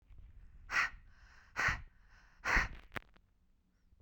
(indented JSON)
{
  "exhalation_length": "4.0 s",
  "exhalation_amplitude": 4761,
  "exhalation_signal_mean_std_ratio": 0.39,
  "survey_phase": "beta (2021-08-13 to 2022-03-07)",
  "age": "18-44",
  "gender": "Female",
  "wearing_mask": "No",
  "symptom_none": true,
  "smoker_status": "Ex-smoker",
  "respiratory_condition_asthma": true,
  "respiratory_condition_other": false,
  "recruitment_source": "REACT",
  "submission_delay": "1 day",
  "covid_test_result": "Negative",
  "covid_test_method": "RT-qPCR",
  "influenza_a_test_result": "Negative",
  "influenza_b_test_result": "Negative"
}